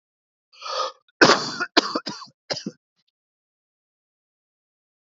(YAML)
cough_length: 5.0 s
cough_amplitude: 30146
cough_signal_mean_std_ratio: 0.27
survey_phase: beta (2021-08-13 to 2022-03-07)
age: 45-64
gender: Male
wearing_mask: 'No'
symptom_cough_any: true
symptom_runny_or_blocked_nose: true
symptom_sore_throat: true
symptom_fatigue: true
symptom_headache: true
symptom_onset: 2 days
smoker_status: Never smoked
respiratory_condition_asthma: false
respiratory_condition_other: false
recruitment_source: Test and Trace
submission_delay: 2 days
covid_test_result: Positive
covid_test_method: RT-qPCR